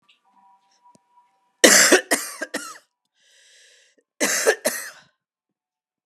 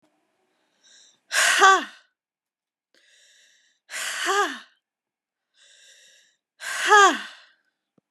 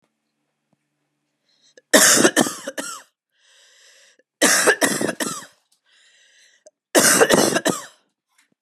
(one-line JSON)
{"cough_length": "6.1 s", "cough_amplitude": 32768, "cough_signal_mean_std_ratio": 0.3, "exhalation_length": "8.1 s", "exhalation_amplitude": 30166, "exhalation_signal_mean_std_ratio": 0.31, "three_cough_length": "8.6 s", "three_cough_amplitude": 32767, "three_cough_signal_mean_std_ratio": 0.39, "survey_phase": "beta (2021-08-13 to 2022-03-07)", "age": "18-44", "gender": "Female", "wearing_mask": "No", "symptom_cough_any": true, "symptom_new_continuous_cough": true, "symptom_runny_or_blocked_nose": true, "symptom_sore_throat": true, "symptom_onset": "6 days", "smoker_status": "Never smoked", "respiratory_condition_asthma": false, "respiratory_condition_other": false, "recruitment_source": "Test and Trace", "submission_delay": "2 days", "covid_test_result": "Positive", "covid_test_method": "RT-qPCR", "covid_ct_value": 18.4, "covid_ct_gene": "ORF1ab gene", "covid_ct_mean": 19.0, "covid_viral_load": "600000 copies/ml", "covid_viral_load_category": "Low viral load (10K-1M copies/ml)"}